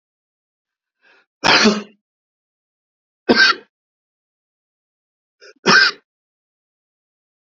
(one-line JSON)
{"three_cough_length": "7.4 s", "three_cough_amplitude": 32768, "three_cough_signal_mean_std_ratio": 0.27, "survey_phase": "beta (2021-08-13 to 2022-03-07)", "age": "45-64", "gender": "Male", "wearing_mask": "No", "symptom_none": true, "smoker_status": "Never smoked", "respiratory_condition_asthma": true, "respiratory_condition_other": false, "recruitment_source": "REACT", "submission_delay": "3 days", "covid_test_result": "Negative", "covid_test_method": "RT-qPCR", "influenza_a_test_result": "Negative", "influenza_b_test_result": "Negative"}